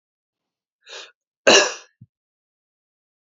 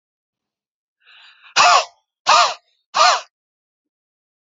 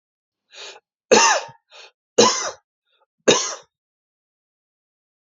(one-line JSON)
{"cough_length": "3.2 s", "cough_amplitude": 31380, "cough_signal_mean_std_ratio": 0.22, "exhalation_length": "4.5 s", "exhalation_amplitude": 29315, "exhalation_signal_mean_std_ratio": 0.33, "three_cough_length": "5.3 s", "three_cough_amplitude": 30096, "three_cough_signal_mean_std_ratio": 0.3, "survey_phase": "beta (2021-08-13 to 2022-03-07)", "age": "45-64", "gender": "Male", "wearing_mask": "No", "symptom_none": true, "smoker_status": "Never smoked", "respiratory_condition_asthma": false, "respiratory_condition_other": false, "recruitment_source": "REACT", "submission_delay": "2 days", "covid_test_result": "Negative", "covid_test_method": "RT-qPCR", "influenza_a_test_result": "Negative", "influenza_b_test_result": "Negative"}